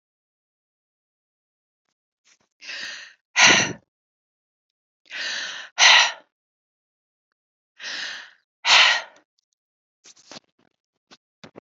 {"exhalation_length": "11.6 s", "exhalation_amplitude": 31260, "exhalation_signal_mean_std_ratio": 0.27, "survey_phase": "beta (2021-08-13 to 2022-03-07)", "age": "65+", "gender": "Female", "wearing_mask": "No", "symptom_cough_any": true, "symptom_diarrhoea": true, "symptom_fatigue": true, "symptom_fever_high_temperature": true, "symptom_change_to_sense_of_smell_or_taste": true, "symptom_loss_of_taste": true, "symptom_onset": "3 days", "smoker_status": "Never smoked", "respiratory_condition_asthma": true, "respiratory_condition_other": false, "recruitment_source": "Test and Trace", "submission_delay": "2 days", "covid_test_result": "Positive", "covid_test_method": "RT-qPCR"}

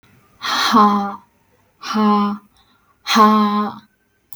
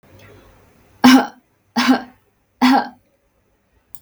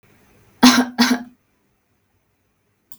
{"exhalation_length": "4.4 s", "exhalation_amplitude": 32766, "exhalation_signal_mean_std_ratio": 0.55, "three_cough_length": "4.0 s", "three_cough_amplitude": 32767, "three_cough_signal_mean_std_ratio": 0.34, "cough_length": "3.0 s", "cough_amplitude": 32768, "cough_signal_mean_std_ratio": 0.3, "survey_phase": "beta (2021-08-13 to 2022-03-07)", "age": "18-44", "gender": "Female", "wearing_mask": "Yes", "symptom_none": true, "smoker_status": "Never smoked", "respiratory_condition_asthma": false, "respiratory_condition_other": false, "recruitment_source": "REACT", "submission_delay": "2 days", "covid_test_result": "Negative", "covid_test_method": "RT-qPCR", "influenza_a_test_result": "Negative", "influenza_b_test_result": "Negative"}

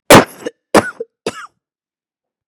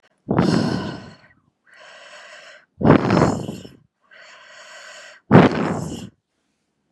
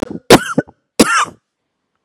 {"cough_length": "2.5 s", "cough_amplitude": 32768, "cough_signal_mean_std_ratio": 0.28, "exhalation_length": "6.9 s", "exhalation_amplitude": 32768, "exhalation_signal_mean_std_ratio": 0.39, "three_cough_length": "2.0 s", "three_cough_amplitude": 32768, "three_cough_signal_mean_std_ratio": 0.36, "survey_phase": "beta (2021-08-13 to 2022-03-07)", "age": "45-64", "gender": "Female", "wearing_mask": "No", "symptom_cough_any": true, "symptom_sore_throat": true, "symptom_fatigue": true, "symptom_headache": true, "symptom_change_to_sense_of_smell_or_taste": true, "symptom_onset": "3 days", "smoker_status": "Ex-smoker", "respiratory_condition_asthma": false, "respiratory_condition_other": false, "recruitment_source": "Test and Trace", "submission_delay": "2 days", "covid_test_result": "Positive", "covid_test_method": "LAMP"}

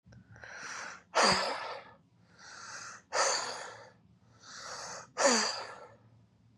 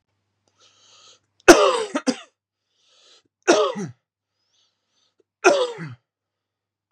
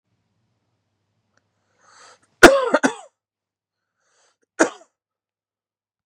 {"exhalation_length": "6.6 s", "exhalation_amplitude": 8587, "exhalation_signal_mean_std_ratio": 0.46, "three_cough_length": "6.9 s", "three_cough_amplitude": 32768, "three_cough_signal_mean_std_ratio": 0.27, "cough_length": "6.1 s", "cough_amplitude": 32768, "cough_signal_mean_std_ratio": 0.18, "survey_phase": "beta (2021-08-13 to 2022-03-07)", "age": "18-44", "gender": "Male", "wearing_mask": "No", "symptom_cough_any": true, "symptom_new_continuous_cough": true, "symptom_runny_or_blocked_nose": true, "symptom_shortness_of_breath": true, "symptom_fatigue": true, "smoker_status": "Ex-smoker", "respiratory_condition_asthma": false, "respiratory_condition_other": false, "recruitment_source": "Test and Trace", "submission_delay": "2 days", "covid_test_result": "Positive", "covid_test_method": "LFT"}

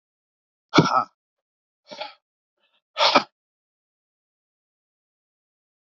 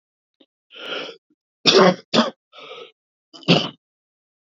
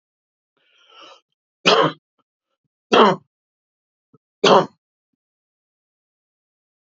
{"exhalation_length": "5.9 s", "exhalation_amplitude": 26572, "exhalation_signal_mean_std_ratio": 0.22, "cough_length": "4.4 s", "cough_amplitude": 29593, "cough_signal_mean_std_ratio": 0.32, "three_cough_length": "7.0 s", "three_cough_amplitude": 31748, "three_cough_signal_mean_std_ratio": 0.25, "survey_phase": "beta (2021-08-13 to 2022-03-07)", "age": "45-64", "gender": "Male", "wearing_mask": "No", "symptom_cough_any": true, "symptom_runny_or_blocked_nose": true, "symptom_shortness_of_breath": true, "symptom_sore_throat": true, "symptom_fatigue": true, "symptom_headache": true, "symptom_change_to_sense_of_smell_or_taste": true, "symptom_onset": "4 days", "smoker_status": "Never smoked", "respiratory_condition_asthma": true, "respiratory_condition_other": false, "recruitment_source": "Test and Trace", "submission_delay": "3 days", "covid_test_result": "Positive", "covid_test_method": "RT-qPCR"}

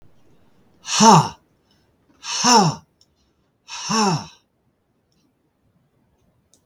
{"exhalation_length": "6.7 s", "exhalation_amplitude": 32766, "exhalation_signal_mean_std_ratio": 0.32, "survey_phase": "beta (2021-08-13 to 2022-03-07)", "age": "65+", "gender": "Male", "wearing_mask": "No", "symptom_none": true, "smoker_status": "Ex-smoker", "respiratory_condition_asthma": false, "respiratory_condition_other": false, "recruitment_source": "REACT", "submission_delay": "1 day", "covid_test_result": "Negative", "covid_test_method": "RT-qPCR", "influenza_a_test_result": "Negative", "influenza_b_test_result": "Negative"}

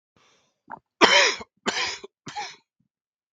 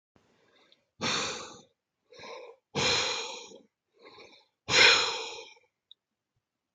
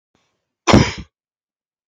{"three_cough_length": "3.3 s", "three_cough_amplitude": 32768, "three_cough_signal_mean_std_ratio": 0.33, "exhalation_length": "6.7 s", "exhalation_amplitude": 15703, "exhalation_signal_mean_std_ratio": 0.36, "cough_length": "1.9 s", "cough_amplitude": 32768, "cough_signal_mean_std_ratio": 0.26, "survey_phase": "beta (2021-08-13 to 2022-03-07)", "age": "45-64", "gender": "Male", "wearing_mask": "No", "symptom_cough_any": true, "symptom_runny_or_blocked_nose": true, "symptom_fatigue": true, "symptom_fever_high_temperature": true, "symptom_headache": true, "symptom_change_to_sense_of_smell_or_taste": true, "symptom_loss_of_taste": true, "symptom_onset": "4 days", "smoker_status": "Never smoked", "respiratory_condition_asthma": false, "respiratory_condition_other": false, "recruitment_source": "Test and Trace", "submission_delay": "2 days", "covid_test_result": "Positive", "covid_test_method": "RT-qPCR"}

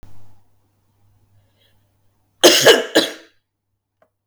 {"cough_length": "4.3 s", "cough_amplitude": 32768, "cough_signal_mean_std_ratio": 0.29, "survey_phase": "beta (2021-08-13 to 2022-03-07)", "age": "45-64", "gender": "Female", "wearing_mask": "No", "symptom_cough_any": true, "symptom_runny_or_blocked_nose": true, "symptom_sore_throat": true, "symptom_fatigue": true, "symptom_fever_high_temperature": true, "symptom_headache": true, "symptom_change_to_sense_of_smell_or_taste": true, "symptom_loss_of_taste": true, "smoker_status": "Never smoked", "respiratory_condition_asthma": false, "respiratory_condition_other": false, "recruitment_source": "Test and Trace", "submission_delay": "2 days", "covid_test_result": "Positive", "covid_test_method": "RT-qPCR", "covid_ct_value": 18.3, "covid_ct_gene": "ORF1ab gene", "covid_ct_mean": 18.6, "covid_viral_load": "780000 copies/ml", "covid_viral_load_category": "Low viral load (10K-1M copies/ml)"}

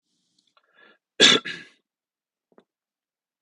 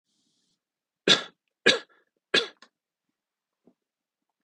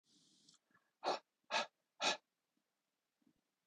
{"cough_length": "3.4 s", "cough_amplitude": 28354, "cough_signal_mean_std_ratio": 0.2, "three_cough_length": "4.4 s", "three_cough_amplitude": 19590, "three_cough_signal_mean_std_ratio": 0.2, "exhalation_length": "3.7 s", "exhalation_amplitude": 2258, "exhalation_signal_mean_std_ratio": 0.28, "survey_phase": "beta (2021-08-13 to 2022-03-07)", "age": "18-44", "gender": "Male", "wearing_mask": "No", "symptom_none": true, "smoker_status": "Never smoked", "respiratory_condition_asthma": false, "respiratory_condition_other": false, "recruitment_source": "REACT", "submission_delay": "2 days", "covid_test_result": "Negative", "covid_test_method": "RT-qPCR", "influenza_a_test_result": "Negative", "influenza_b_test_result": "Negative"}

